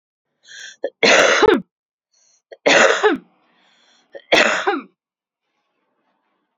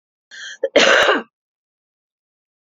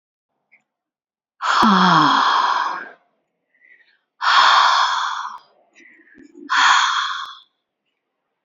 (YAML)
three_cough_length: 6.6 s
three_cough_amplitude: 32767
three_cough_signal_mean_std_ratio: 0.39
cough_length: 2.6 s
cough_amplitude: 32768
cough_signal_mean_std_ratio: 0.36
exhalation_length: 8.4 s
exhalation_amplitude: 27946
exhalation_signal_mean_std_ratio: 0.52
survey_phase: alpha (2021-03-01 to 2021-08-12)
age: 45-64
gender: Female
wearing_mask: 'No'
symptom_fatigue: true
symptom_headache: true
smoker_status: Never smoked
respiratory_condition_asthma: true
respiratory_condition_other: false
recruitment_source: Test and Trace
submission_delay: 1 day
covid_test_result: Positive
covid_test_method: RT-qPCR
covid_ct_value: 20.6
covid_ct_gene: ORF1ab gene